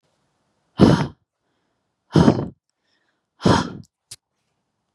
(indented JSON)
{
  "exhalation_length": "4.9 s",
  "exhalation_amplitude": 32767,
  "exhalation_signal_mean_std_ratio": 0.29,
  "survey_phase": "beta (2021-08-13 to 2022-03-07)",
  "age": "18-44",
  "gender": "Female",
  "wearing_mask": "No",
  "symptom_none": true,
  "symptom_onset": "5 days",
  "smoker_status": "Never smoked",
  "respiratory_condition_asthma": false,
  "respiratory_condition_other": false,
  "recruitment_source": "REACT",
  "submission_delay": "2 days",
  "covid_test_result": "Negative",
  "covid_test_method": "RT-qPCR",
  "influenza_a_test_result": "Negative",
  "influenza_b_test_result": "Negative"
}